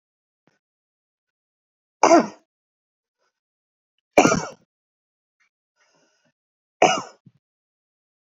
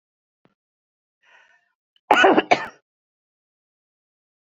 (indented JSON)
{
  "three_cough_length": "8.3 s",
  "three_cough_amplitude": 28318,
  "three_cough_signal_mean_std_ratio": 0.2,
  "cough_length": "4.4 s",
  "cough_amplitude": 30041,
  "cough_signal_mean_std_ratio": 0.23,
  "survey_phase": "beta (2021-08-13 to 2022-03-07)",
  "age": "45-64",
  "gender": "Female",
  "wearing_mask": "No",
  "symptom_abdominal_pain": true,
  "symptom_diarrhoea": true,
  "symptom_headache": true,
  "smoker_status": "Ex-smoker",
  "respiratory_condition_asthma": true,
  "respiratory_condition_other": false,
  "recruitment_source": "REACT",
  "submission_delay": "1 day",
  "covid_test_result": "Negative",
  "covid_test_method": "RT-qPCR",
  "influenza_a_test_result": "Unknown/Void",
  "influenza_b_test_result": "Unknown/Void"
}